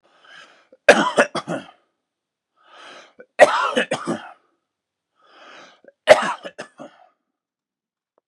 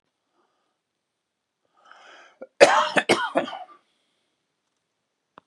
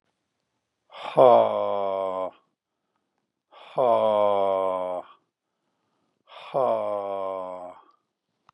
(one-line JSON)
{"three_cough_length": "8.3 s", "three_cough_amplitude": 32768, "three_cough_signal_mean_std_ratio": 0.27, "cough_length": "5.5 s", "cough_amplitude": 32768, "cough_signal_mean_std_ratio": 0.25, "exhalation_length": "8.5 s", "exhalation_amplitude": 22969, "exhalation_signal_mean_std_ratio": 0.44, "survey_phase": "beta (2021-08-13 to 2022-03-07)", "age": "45-64", "gender": "Male", "wearing_mask": "No", "symptom_cough_any": true, "symptom_fatigue": true, "symptom_headache": true, "symptom_loss_of_taste": true, "smoker_status": "Ex-smoker", "respiratory_condition_asthma": false, "respiratory_condition_other": false, "recruitment_source": "Test and Trace", "submission_delay": "2 days", "covid_test_result": "Positive", "covid_test_method": "ePCR"}